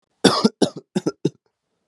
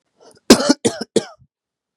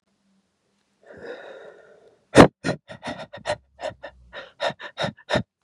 {"three_cough_length": "1.9 s", "three_cough_amplitude": 32767, "three_cough_signal_mean_std_ratio": 0.34, "cough_length": "2.0 s", "cough_amplitude": 32768, "cough_signal_mean_std_ratio": 0.3, "exhalation_length": "5.6 s", "exhalation_amplitude": 32768, "exhalation_signal_mean_std_ratio": 0.24, "survey_phase": "beta (2021-08-13 to 2022-03-07)", "age": "18-44", "gender": "Male", "wearing_mask": "No", "symptom_none": true, "smoker_status": "Current smoker (1 to 10 cigarettes per day)", "respiratory_condition_asthma": false, "respiratory_condition_other": false, "recruitment_source": "REACT", "submission_delay": "5 days", "covid_test_result": "Negative", "covid_test_method": "RT-qPCR", "influenza_a_test_result": "Negative", "influenza_b_test_result": "Negative"}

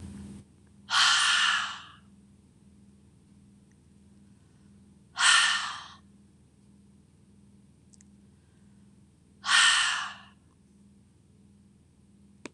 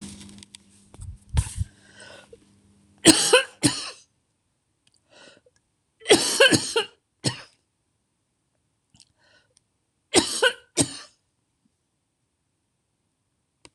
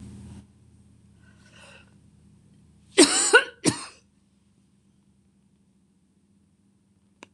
{"exhalation_length": "12.5 s", "exhalation_amplitude": 14865, "exhalation_signal_mean_std_ratio": 0.35, "three_cough_length": "13.7 s", "three_cough_amplitude": 26028, "three_cough_signal_mean_std_ratio": 0.27, "cough_length": "7.3 s", "cough_amplitude": 25948, "cough_signal_mean_std_ratio": 0.22, "survey_phase": "beta (2021-08-13 to 2022-03-07)", "age": "65+", "gender": "Female", "wearing_mask": "No", "symptom_none": true, "smoker_status": "Never smoked", "respiratory_condition_asthma": true, "respiratory_condition_other": false, "recruitment_source": "REACT", "submission_delay": "2 days", "covid_test_result": "Negative", "covid_test_method": "RT-qPCR", "influenza_a_test_result": "Negative", "influenza_b_test_result": "Negative"}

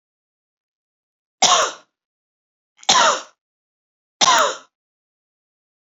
{"three_cough_length": "5.9 s", "three_cough_amplitude": 32768, "three_cough_signal_mean_std_ratio": 0.31, "survey_phase": "beta (2021-08-13 to 2022-03-07)", "age": "18-44", "gender": "Female", "wearing_mask": "No", "symptom_runny_or_blocked_nose": true, "symptom_headache": true, "symptom_onset": "8 days", "smoker_status": "Never smoked", "respiratory_condition_asthma": false, "respiratory_condition_other": false, "recruitment_source": "REACT", "submission_delay": "1 day", "covid_test_result": "Negative", "covid_test_method": "RT-qPCR"}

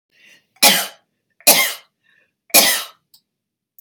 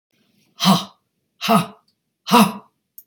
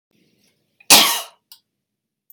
{"three_cough_length": "3.8 s", "three_cough_amplitude": 32768, "three_cough_signal_mean_std_ratio": 0.34, "exhalation_length": "3.1 s", "exhalation_amplitude": 31925, "exhalation_signal_mean_std_ratio": 0.36, "cough_length": "2.3 s", "cough_amplitude": 32768, "cough_signal_mean_std_ratio": 0.26, "survey_phase": "beta (2021-08-13 to 2022-03-07)", "age": "65+", "gender": "Female", "wearing_mask": "No", "symptom_none": true, "smoker_status": "Current smoker (e-cigarettes or vapes only)", "respiratory_condition_asthma": false, "respiratory_condition_other": false, "recruitment_source": "REACT", "submission_delay": "1 day", "covid_test_result": "Negative", "covid_test_method": "RT-qPCR"}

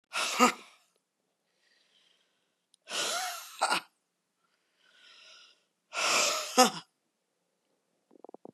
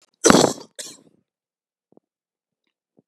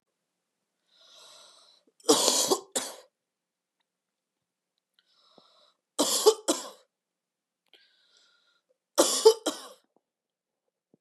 {"exhalation_length": "8.5 s", "exhalation_amplitude": 19770, "exhalation_signal_mean_std_ratio": 0.32, "cough_length": "3.1 s", "cough_amplitude": 32768, "cough_signal_mean_std_ratio": 0.22, "three_cough_length": "11.0 s", "three_cough_amplitude": 20921, "three_cough_signal_mean_std_ratio": 0.26, "survey_phase": "beta (2021-08-13 to 2022-03-07)", "age": "45-64", "gender": "Female", "wearing_mask": "No", "symptom_cough_any": true, "symptom_new_continuous_cough": true, "symptom_runny_or_blocked_nose": true, "symptom_shortness_of_breath": true, "symptom_sore_throat": true, "symptom_diarrhoea": true, "symptom_fatigue": true, "symptom_headache": true, "symptom_onset": "3 days", "smoker_status": "Never smoked", "respiratory_condition_asthma": false, "respiratory_condition_other": false, "recruitment_source": "Test and Trace", "submission_delay": "2 days", "covid_test_result": "Positive", "covid_test_method": "RT-qPCR", "covid_ct_value": 19.6, "covid_ct_gene": "N gene"}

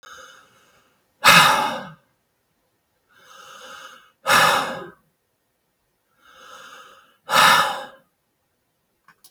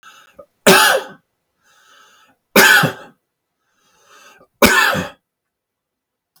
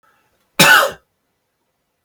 {"exhalation_length": "9.3 s", "exhalation_amplitude": 32768, "exhalation_signal_mean_std_ratio": 0.32, "three_cough_length": "6.4 s", "three_cough_amplitude": 32768, "three_cough_signal_mean_std_ratio": 0.35, "cough_length": "2.0 s", "cough_amplitude": 32768, "cough_signal_mean_std_ratio": 0.32, "survey_phase": "beta (2021-08-13 to 2022-03-07)", "age": "45-64", "gender": "Male", "wearing_mask": "No", "symptom_none": true, "smoker_status": "Never smoked", "respiratory_condition_asthma": false, "respiratory_condition_other": false, "recruitment_source": "REACT", "submission_delay": "3 days", "covid_test_result": "Negative", "covid_test_method": "RT-qPCR", "influenza_a_test_result": "Negative", "influenza_b_test_result": "Negative"}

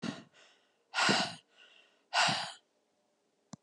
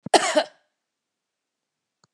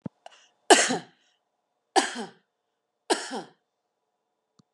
{"exhalation_length": "3.6 s", "exhalation_amplitude": 6327, "exhalation_signal_mean_std_ratio": 0.39, "cough_length": "2.1 s", "cough_amplitude": 28096, "cough_signal_mean_std_ratio": 0.25, "three_cough_length": "4.7 s", "three_cough_amplitude": 31159, "three_cough_signal_mean_std_ratio": 0.25, "survey_phase": "beta (2021-08-13 to 2022-03-07)", "age": "45-64", "gender": "Female", "wearing_mask": "No", "symptom_none": true, "symptom_onset": "5 days", "smoker_status": "Never smoked", "respiratory_condition_asthma": false, "respiratory_condition_other": false, "recruitment_source": "REACT", "submission_delay": "1 day", "covid_test_result": "Negative", "covid_test_method": "RT-qPCR", "influenza_a_test_result": "Negative", "influenza_b_test_result": "Negative"}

